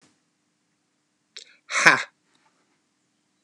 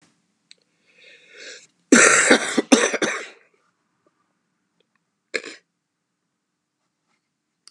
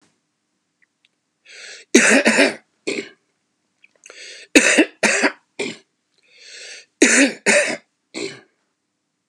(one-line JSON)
{"exhalation_length": "3.4 s", "exhalation_amplitude": 32768, "exhalation_signal_mean_std_ratio": 0.19, "cough_length": "7.7 s", "cough_amplitude": 32768, "cough_signal_mean_std_ratio": 0.28, "three_cough_length": "9.3 s", "three_cough_amplitude": 32768, "three_cough_signal_mean_std_ratio": 0.37, "survey_phase": "beta (2021-08-13 to 2022-03-07)", "age": "65+", "gender": "Male", "wearing_mask": "No", "symptom_cough_any": true, "symptom_runny_or_blocked_nose": true, "symptom_shortness_of_breath": true, "symptom_sore_throat": true, "symptom_fatigue": true, "symptom_onset": "10 days", "smoker_status": "Ex-smoker", "respiratory_condition_asthma": false, "respiratory_condition_other": false, "recruitment_source": "REACT", "submission_delay": "2 days", "covid_test_result": "Negative", "covid_test_method": "RT-qPCR", "influenza_a_test_result": "Negative", "influenza_b_test_result": "Negative"}